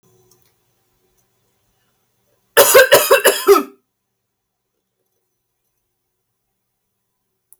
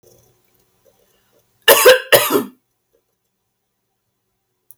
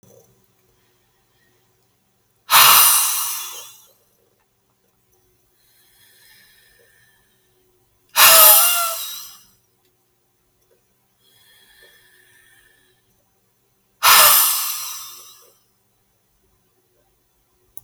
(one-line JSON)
{"three_cough_length": "7.6 s", "three_cough_amplitude": 32768, "three_cough_signal_mean_std_ratio": 0.27, "cough_length": "4.8 s", "cough_amplitude": 32768, "cough_signal_mean_std_ratio": 0.27, "exhalation_length": "17.8 s", "exhalation_amplitude": 32768, "exhalation_signal_mean_std_ratio": 0.29, "survey_phase": "alpha (2021-03-01 to 2021-08-12)", "age": "18-44", "gender": "Female", "wearing_mask": "No", "symptom_cough_any": true, "smoker_status": "Never smoked", "respiratory_condition_asthma": true, "respiratory_condition_other": false, "recruitment_source": "REACT", "submission_delay": "2 days", "covid_test_result": "Negative", "covid_test_method": "RT-qPCR"}